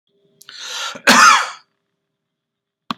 cough_length: 3.0 s
cough_amplitude: 32768
cough_signal_mean_std_ratio: 0.34
survey_phase: beta (2021-08-13 to 2022-03-07)
age: 45-64
gender: Male
wearing_mask: 'No'
symptom_none: true
smoker_status: Never smoked
respiratory_condition_asthma: false
respiratory_condition_other: false
recruitment_source: REACT
submission_delay: 2 days
covid_test_result: Negative
covid_test_method: RT-qPCR
influenza_a_test_result: Negative
influenza_b_test_result: Negative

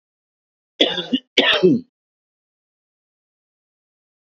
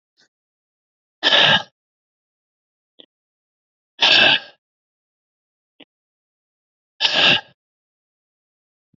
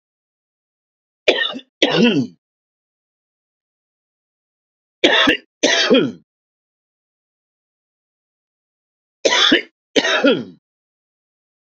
cough_length: 4.3 s
cough_amplitude: 31197
cough_signal_mean_std_ratio: 0.3
exhalation_length: 9.0 s
exhalation_amplitude: 27168
exhalation_signal_mean_std_ratio: 0.28
three_cough_length: 11.7 s
three_cough_amplitude: 32768
three_cough_signal_mean_std_ratio: 0.35
survey_phase: beta (2021-08-13 to 2022-03-07)
age: 45-64
gender: Male
wearing_mask: 'No'
symptom_runny_or_blocked_nose: true
symptom_sore_throat: true
smoker_status: Current smoker (e-cigarettes or vapes only)
respiratory_condition_asthma: false
respiratory_condition_other: false
recruitment_source: REACT
submission_delay: 2 days
covid_test_result: Negative
covid_test_method: RT-qPCR
influenza_a_test_result: Negative
influenza_b_test_result: Negative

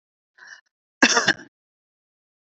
cough_length: 2.5 s
cough_amplitude: 28897
cough_signal_mean_std_ratio: 0.26
survey_phase: beta (2021-08-13 to 2022-03-07)
age: 45-64
gender: Female
wearing_mask: 'No'
symptom_cough_any: true
symptom_sore_throat: true
symptom_change_to_sense_of_smell_or_taste: true
symptom_onset: 4 days
smoker_status: Never smoked
respiratory_condition_asthma: false
respiratory_condition_other: false
recruitment_source: Test and Trace
submission_delay: 1 day
covid_test_result: Positive
covid_test_method: RT-qPCR
covid_ct_value: 14.7
covid_ct_gene: ORF1ab gene
covid_ct_mean: 14.9
covid_viral_load: 13000000 copies/ml
covid_viral_load_category: High viral load (>1M copies/ml)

